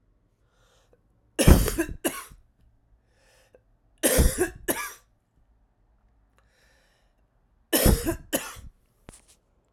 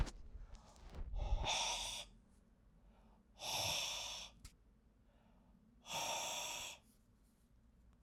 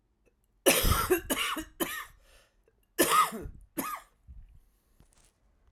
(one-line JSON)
{"three_cough_length": "9.7 s", "three_cough_amplitude": 32767, "three_cough_signal_mean_std_ratio": 0.29, "exhalation_length": "8.0 s", "exhalation_amplitude": 1919, "exhalation_signal_mean_std_ratio": 0.57, "cough_length": "5.7 s", "cough_amplitude": 11545, "cough_signal_mean_std_ratio": 0.42, "survey_phase": "alpha (2021-03-01 to 2021-08-12)", "age": "45-64", "gender": "Male", "wearing_mask": "No", "symptom_cough_any": true, "symptom_new_continuous_cough": true, "symptom_fatigue": true, "symptom_fever_high_temperature": true, "symptom_headache": true, "symptom_change_to_sense_of_smell_or_taste": true, "symptom_loss_of_taste": true, "smoker_status": "Never smoked", "respiratory_condition_asthma": false, "respiratory_condition_other": false, "recruitment_source": "Test and Trace", "submission_delay": "1 day", "covid_test_result": "Positive", "covid_test_method": "RT-qPCR", "covid_ct_value": 27.2, "covid_ct_gene": "N gene"}